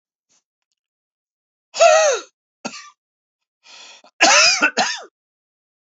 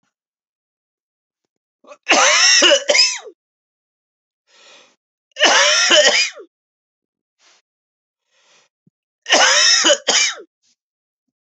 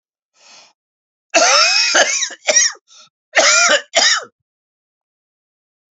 {
  "exhalation_length": "5.9 s",
  "exhalation_amplitude": 28607,
  "exhalation_signal_mean_std_ratio": 0.36,
  "three_cough_length": "11.5 s",
  "three_cough_amplitude": 32768,
  "three_cough_signal_mean_std_ratio": 0.42,
  "cough_length": "6.0 s",
  "cough_amplitude": 32489,
  "cough_signal_mean_std_ratio": 0.48,
  "survey_phase": "beta (2021-08-13 to 2022-03-07)",
  "age": "45-64",
  "gender": "Male",
  "wearing_mask": "No",
  "symptom_new_continuous_cough": true,
  "symptom_runny_or_blocked_nose": true,
  "symptom_shortness_of_breath": true,
  "symptom_sore_throat": true,
  "symptom_fatigue": true,
  "symptom_fever_high_temperature": true,
  "symptom_headache": true,
  "symptom_change_to_sense_of_smell_or_taste": true,
  "symptom_onset": "2 days",
  "smoker_status": "Never smoked",
  "respiratory_condition_asthma": false,
  "respiratory_condition_other": false,
  "recruitment_source": "Test and Trace",
  "submission_delay": "1 day",
  "covid_test_result": "Positive",
  "covid_test_method": "ePCR"
}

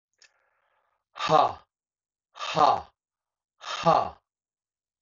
{
  "exhalation_length": "5.0 s",
  "exhalation_amplitude": 15800,
  "exhalation_signal_mean_std_ratio": 0.32,
  "survey_phase": "beta (2021-08-13 to 2022-03-07)",
  "age": "45-64",
  "gender": "Male",
  "wearing_mask": "No",
  "symptom_cough_any": true,
  "symptom_runny_or_blocked_nose": true,
  "symptom_shortness_of_breath": true,
  "symptom_onset": "5 days",
  "smoker_status": "Ex-smoker",
  "respiratory_condition_asthma": false,
  "respiratory_condition_other": false,
  "recruitment_source": "Test and Trace",
  "submission_delay": "2 days",
  "covid_test_result": "Positive",
  "covid_test_method": "RT-qPCR",
  "covid_ct_value": 33.9,
  "covid_ct_gene": "N gene"
}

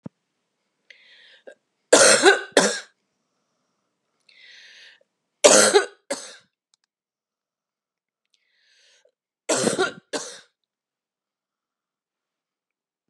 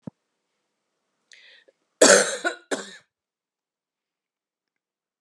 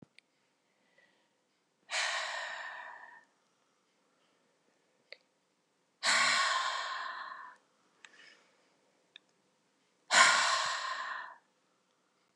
{
  "three_cough_length": "13.1 s",
  "three_cough_amplitude": 32260,
  "three_cough_signal_mean_std_ratio": 0.26,
  "cough_length": "5.2 s",
  "cough_amplitude": 31583,
  "cough_signal_mean_std_ratio": 0.22,
  "exhalation_length": "12.4 s",
  "exhalation_amplitude": 9658,
  "exhalation_signal_mean_std_ratio": 0.37,
  "survey_phase": "beta (2021-08-13 to 2022-03-07)",
  "age": "45-64",
  "gender": "Female",
  "wearing_mask": "No",
  "symptom_cough_any": true,
  "symptom_runny_or_blocked_nose": true,
  "symptom_onset": "12 days",
  "smoker_status": "Never smoked",
  "respiratory_condition_asthma": false,
  "respiratory_condition_other": false,
  "recruitment_source": "REACT",
  "submission_delay": "2 days",
  "covid_test_result": "Negative",
  "covid_test_method": "RT-qPCR",
  "influenza_a_test_result": "Negative",
  "influenza_b_test_result": "Negative"
}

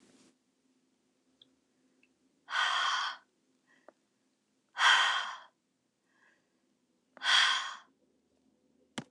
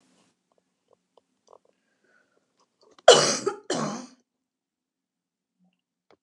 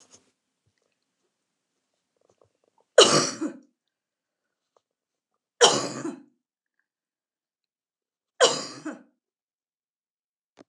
{
  "exhalation_length": "9.1 s",
  "exhalation_amplitude": 8374,
  "exhalation_signal_mean_std_ratio": 0.33,
  "cough_length": "6.2 s",
  "cough_amplitude": 29204,
  "cough_signal_mean_std_ratio": 0.2,
  "three_cough_length": "10.7 s",
  "three_cough_amplitude": 28020,
  "three_cough_signal_mean_std_ratio": 0.21,
  "survey_phase": "beta (2021-08-13 to 2022-03-07)",
  "age": "45-64",
  "gender": "Female",
  "wearing_mask": "No",
  "symptom_shortness_of_breath": true,
  "smoker_status": "Never smoked",
  "respiratory_condition_asthma": false,
  "respiratory_condition_other": false,
  "recruitment_source": "REACT",
  "submission_delay": "3 days",
  "covid_test_result": "Negative",
  "covid_test_method": "RT-qPCR"
}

